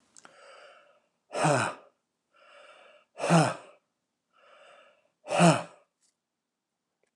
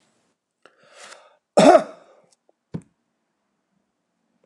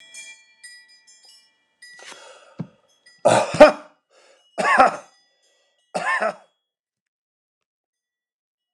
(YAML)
exhalation_length: 7.2 s
exhalation_amplitude: 13487
exhalation_signal_mean_std_ratio: 0.3
cough_length: 4.5 s
cough_amplitude: 29203
cough_signal_mean_std_ratio: 0.2
three_cough_length: 8.7 s
three_cough_amplitude: 29204
three_cough_signal_mean_std_ratio: 0.25
survey_phase: beta (2021-08-13 to 2022-03-07)
age: 45-64
gender: Male
wearing_mask: 'No'
symptom_none: true
smoker_status: Never smoked
respiratory_condition_asthma: false
respiratory_condition_other: false
recruitment_source: REACT
submission_delay: 2 days
covid_test_result: Negative
covid_test_method: RT-qPCR